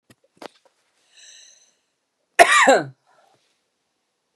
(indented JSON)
{
  "cough_length": "4.4 s",
  "cough_amplitude": 32768,
  "cough_signal_mean_std_ratio": 0.25,
  "survey_phase": "beta (2021-08-13 to 2022-03-07)",
  "age": "45-64",
  "gender": "Female",
  "wearing_mask": "No",
  "symptom_none": true,
  "smoker_status": "Never smoked",
  "respiratory_condition_asthma": true,
  "respiratory_condition_other": false,
  "recruitment_source": "REACT",
  "submission_delay": "2 days",
  "covid_test_result": "Negative",
  "covid_test_method": "RT-qPCR",
  "influenza_a_test_result": "Negative",
  "influenza_b_test_result": "Negative"
}